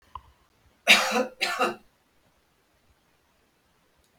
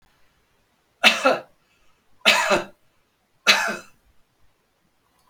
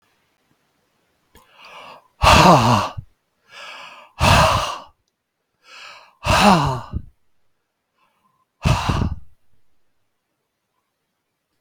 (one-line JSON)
{"cough_length": "4.2 s", "cough_amplitude": 23143, "cough_signal_mean_std_ratio": 0.29, "three_cough_length": "5.3 s", "three_cough_amplitude": 32768, "three_cough_signal_mean_std_ratio": 0.32, "exhalation_length": "11.6 s", "exhalation_amplitude": 32768, "exhalation_signal_mean_std_ratio": 0.36, "survey_phase": "beta (2021-08-13 to 2022-03-07)", "age": "65+", "gender": "Male", "wearing_mask": "No", "symptom_none": true, "smoker_status": "Ex-smoker", "respiratory_condition_asthma": false, "respiratory_condition_other": false, "recruitment_source": "REACT", "submission_delay": "0 days", "covid_test_result": "Negative", "covid_test_method": "RT-qPCR", "influenza_a_test_result": "Negative", "influenza_b_test_result": "Negative"}